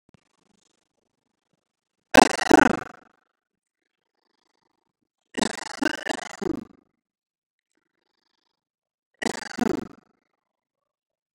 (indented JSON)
{
  "three_cough_length": "11.3 s",
  "three_cough_amplitude": 32360,
  "three_cough_signal_mean_std_ratio": 0.19,
  "survey_phase": "beta (2021-08-13 to 2022-03-07)",
  "age": "45-64",
  "gender": "Male",
  "wearing_mask": "No",
  "symptom_none": true,
  "smoker_status": "Ex-smoker",
  "respiratory_condition_asthma": false,
  "respiratory_condition_other": false,
  "recruitment_source": "REACT",
  "submission_delay": "1 day",
  "covid_test_result": "Negative",
  "covid_test_method": "RT-qPCR",
  "influenza_a_test_result": "Negative",
  "influenza_b_test_result": "Negative"
}